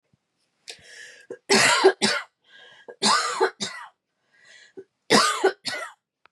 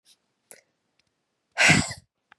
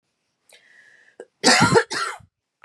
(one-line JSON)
{"three_cough_length": "6.3 s", "three_cough_amplitude": 24145, "three_cough_signal_mean_std_ratio": 0.42, "exhalation_length": "2.4 s", "exhalation_amplitude": 21794, "exhalation_signal_mean_std_ratio": 0.28, "cough_length": "2.6 s", "cough_amplitude": 25760, "cough_signal_mean_std_ratio": 0.36, "survey_phase": "beta (2021-08-13 to 2022-03-07)", "age": "18-44", "gender": "Female", "wearing_mask": "No", "symptom_cough_any": true, "symptom_sore_throat": true, "symptom_onset": "6 days", "smoker_status": "Never smoked", "respiratory_condition_asthma": true, "respiratory_condition_other": false, "recruitment_source": "REACT", "submission_delay": "4 days", "covid_test_result": "Negative", "covid_test_method": "RT-qPCR", "influenza_a_test_result": "Negative", "influenza_b_test_result": "Negative"}